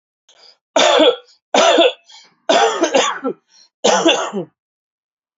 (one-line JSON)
{"cough_length": "5.4 s", "cough_amplitude": 29642, "cough_signal_mean_std_ratio": 0.52, "survey_phase": "alpha (2021-03-01 to 2021-08-12)", "age": "18-44", "gender": "Male", "wearing_mask": "No", "symptom_fatigue": true, "symptom_fever_high_temperature": true, "smoker_status": "Current smoker (1 to 10 cigarettes per day)", "respiratory_condition_asthma": false, "respiratory_condition_other": false, "recruitment_source": "Test and Trace", "submission_delay": "1 day", "covid_test_result": "Positive", "covid_test_method": "RT-qPCR", "covid_ct_value": 22.5, "covid_ct_gene": "ORF1ab gene"}